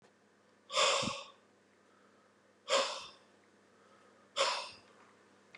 {"exhalation_length": "5.6 s", "exhalation_amplitude": 4583, "exhalation_signal_mean_std_ratio": 0.37, "survey_phase": "beta (2021-08-13 to 2022-03-07)", "age": "65+", "gender": "Male", "wearing_mask": "No", "symptom_none": true, "symptom_onset": "6 days", "smoker_status": "Ex-smoker", "respiratory_condition_asthma": false, "respiratory_condition_other": false, "recruitment_source": "REACT", "submission_delay": "6 days", "covid_test_result": "Negative", "covid_test_method": "RT-qPCR", "influenza_a_test_result": "Negative", "influenza_b_test_result": "Negative"}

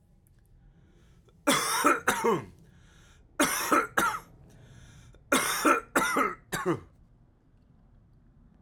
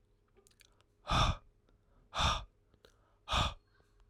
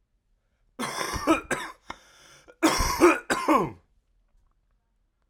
{"three_cough_length": "8.6 s", "three_cough_amplitude": 11909, "three_cough_signal_mean_std_ratio": 0.47, "exhalation_length": "4.1 s", "exhalation_amplitude": 4981, "exhalation_signal_mean_std_ratio": 0.37, "cough_length": "5.3 s", "cough_amplitude": 19697, "cough_signal_mean_std_ratio": 0.41, "survey_phase": "beta (2021-08-13 to 2022-03-07)", "age": "18-44", "gender": "Male", "wearing_mask": "No", "symptom_cough_any": true, "symptom_new_continuous_cough": true, "symptom_sore_throat": true, "symptom_fever_high_temperature": true, "symptom_headache": true, "smoker_status": "Never smoked", "respiratory_condition_asthma": false, "respiratory_condition_other": false, "recruitment_source": "Test and Trace", "submission_delay": "1 day", "covid_test_result": "Positive", "covid_test_method": "RT-qPCR", "covid_ct_value": 30.0, "covid_ct_gene": "N gene"}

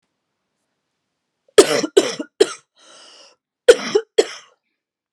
{"cough_length": "5.1 s", "cough_amplitude": 32768, "cough_signal_mean_std_ratio": 0.25, "survey_phase": "beta (2021-08-13 to 2022-03-07)", "age": "18-44", "gender": "Female", "wearing_mask": "No", "symptom_cough_any": true, "symptom_new_continuous_cough": true, "symptom_shortness_of_breath": true, "symptom_sore_throat": true, "symptom_onset": "8 days", "smoker_status": "Never smoked", "respiratory_condition_asthma": false, "respiratory_condition_other": false, "recruitment_source": "REACT", "submission_delay": "7 days", "covid_test_result": "Negative", "covid_test_method": "RT-qPCR"}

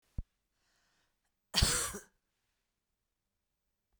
{"cough_length": "4.0 s", "cough_amplitude": 6555, "cough_signal_mean_std_ratio": 0.24, "survey_phase": "beta (2021-08-13 to 2022-03-07)", "age": "45-64", "gender": "Female", "wearing_mask": "No", "symptom_runny_or_blocked_nose": true, "symptom_fatigue": true, "symptom_headache": true, "symptom_change_to_sense_of_smell_or_taste": true, "symptom_loss_of_taste": true, "symptom_onset": "3 days", "smoker_status": "Ex-smoker", "respiratory_condition_asthma": false, "respiratory_condition_other": false, "recruitment_source": "Test and Trace", "submission_delay": "1 day", "covid_test_result": "Positive", "covid_test_method": "RT-qPCR", "covid_ct_value": 21.7, "covid_ct_gene": "ORF1ab gene", "covid_ct_mean": 22.1, "covid_viral_load": "56000 copies/ml", "covid_viral_load_category": "Low viral load (10K-1M copies/ml)"}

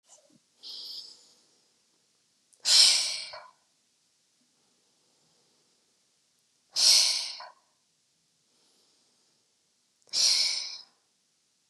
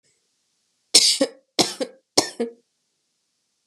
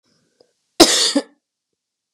{"exhalation_length": "11.7 s", "exhalation_amplitude": 16942, "exhalation_signal_mean_std_ratio": 0.29, "three_cough_length": "3.7 s", "three_cough_amplitude": 32768, "three_cough_signal_mean_std_ratio": 0.29, "cough_length": "2.1 s", "cough_amplitude": 32768, "cough_signal_mean_std_ratio": 0.31, "survey_phase": "beta (2021-08-13 to 2022-03-07)", "age": "18-44", "gender": "Female", "wearing_mask": "No", "symptom_cough_any": true, "symptom_headache": true, "symptom_onset": "2 days", "smoker_status": "Never smoked", "respiratory_condition_asthma": false, "respiratory_condition_other": false, "recruitment_source": "Test and Trace", "submission_delay": "0 days", "covid_test_result": "Positive", "covid_test_method": "RT-qPCR", "covid_ct_value": 32.4, "covid_ct_gene": "ORF1ab gene", "covid_ct_mean": 32.7, "covid_viral_load": "19 copies/ml", "covid_viral_load_category": "Minimal viral load (< 10K copies/ml)"}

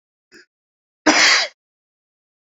{"cough_length": "2.5 s", "cough_amplitude": 31182, "cough_signal_mean_std_ratio": 0.32, "survey_phase": "beta (2021-08-13 to 2022-03-07)", "age": "18-44", "gender": "Male", "wearing_mask": "No", "symptom_none": true, "smoker_status": "Ex-smoker", "respiratory_condition_asthma": true, "respiratory_condition_other": false, "recruitment_source": "REACT", "submission_delay": "2 days", "covid_test_result": "Negative", "covid_test_method": "RT-qPCR"}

